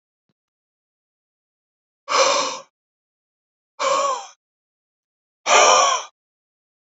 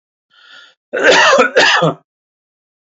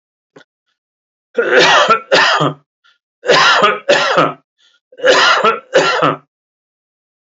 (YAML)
exhalation_length: 6.9 s
exhalation_amplitude: 27829
exhalation_signal_mean_std_ratio: 0.35
cough_length: 3.0 s
cough_amplitude: 32020
cough_signal_mean_std_ratio: 0.49
three_cough_length: 7.3 s
three_cough_amplitude: 30031
three_cough_signal_mean_std_ratio: 0.56
survey_phase: alpha (2021-03-01 to 2021-08-12)
age: 45-64
gender: Male
wearing_mask: 'No'
symptom_none: true
symptom_onset: 2 days
smoker_status: Never smoked
respiratory_condition_asthma: false
respiratory_condition_other: false
recruitment_source: REACT
submission_delay: 1 day
covid_test_result: Negative
covid_test_method: RT-qPCR